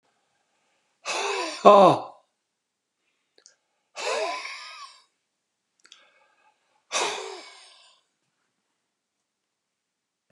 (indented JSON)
{
  "exhalation_length": "10.3 s",
  "exhalation_amplitude": 31063,
  "exhalation_signal_mean_std_ratio": 0.24,
  "survey_phase": "beta (2021-08-13 to 2022-03-07)",
  "age": "65+",
  "gender": "Male",
  "wearing_mask": "No",
  "symptom_cough_any": true,
  "symptom_fatigue": true,
  "symptom_change_to_sense_of_smell_or_taste": true,
  "symptom_other": true,
  "symptom_onset": "5 days",
  "smoker_status": "Never smoked",
  "respiratory_condition_asthma": false,
  "respiratory_condition_other": false,
  "recruitment_source": "Test and Trace",
  "submission_delay": "3 days",
  "covid_test_result": "Positive",
  "covid_test_method": "RT-qPCR",
  "covid_ct_value": 21.5,
  "covid_ct_gene": "ORF1ab gene",
  "covid_ct_mean": 22.3,
  "covid_viral_load": "48000 copies/ml",
  "covid_viral_load_category": "Low viral load (10K-1M copies/ml)"
}